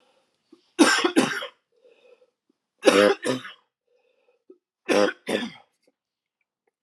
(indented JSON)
{
  "three_cough_length": "6.8 s",
  "three_cough_amplitude": 27047,
  "three_cough_signal_mean_std_ratio": 0.34,
  "survey_phase": "alpha (2021-03-01 to 2021-08-12)",
  "age": "65+",
  "gender": "Male",
  "wearing_mask": "No",
  "symptom_cough_any": true,
  "symptom_headache": true,
  "smoker_status": "Never smoked",
  "respiratory_condition_asthma": true,
  "respiratory_condition_other": false,
  "recruitment_source": "Test and Trace",
  "submission_delay": "2 days",
  "covid_test_result": "Positive",
  "covid_test_method": "RT-qPCR",
  "covid_ct_value": 20.6,
  "covid_ct_gene": "ORF1ab gene",
  "covid_ct_mean": 20.9,
  "covid_viral_load": "140000 copies/ml",
  "covid_viral_load_category": "Low viral load (10K-1M copies/ml)"
}